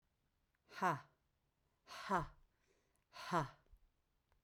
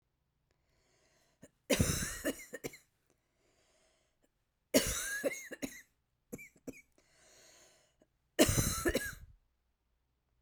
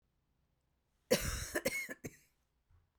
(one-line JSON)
{"exhalation_length": "4.4 s", "exhalation_amplitude": 2234, "exhalation_signal_mean_std_ratio": 0.32, "three_cough_length": "10.4 s", "three_cough_amplitude": 8746, "three_cough_signal_mean_std_ratio": 0.33, "cough_length": "3.0 s", "cough_amplitude": 5294, "cough_signal_mean_std_ratio": 0.36, "survey_phase": "beta (2021-08-13 to 2022-03-07)", "age": "45-64", "gender": "Female", "wearing_mask": "No", "symptom_cough_any": true, "symptom_runny_or_blocked_nose": true, "symptom_sore_throat": true, "symptom_fatigue": true, "symptom_fever_high_temperature": true, "symptom_headache": true, "symptom_onset": "3 days", "smoker_status": "Never smoked", "respiratory_condition_asthma": false, "respiratory_condition_other": false, "recruitment_source": "Test and Trace", "submission_delay": "1 day", "covid_test_result": "Positive", "covid_test_method": "ePCR"}